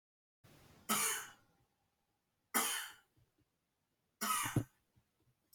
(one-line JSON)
{"three_cough_length": "5.5 s", "three_cough_amplitude": 2991, "three_cough_signal_mean_std_ratio": 0.36, "survey_phase": "alpha (2021-03-01 to 2021-08-12)", "age": "18-44", "gender": "Male", "wearing_mask": "No", "symptom_cough_any": true, "symptom_fatigue": true, "symptom_headache": true, "symptom_change_to_sense_of_smell_or_taste": true, "symptom_loss_of_taste": true, "symptom_onset": "3 days", "smoker_status": "Never smoked", "respiratory_condition_asthma": false, "respiratory_condition_other": false, "recruitment_source": "Test and Trace", "submission_delay": "2 days", "covid_test_result": "Positive", "covid_test_method": "RT-qPCR", "covid_ct_value": 21.1, "covid_ct_gene": "ORF1ab gene", "covid_ct_mean": 21.8, "covid_viral_load": "73000 copies/ml", "covid_viral_load_category": "Low viral load (10K-1M copies/ml)"}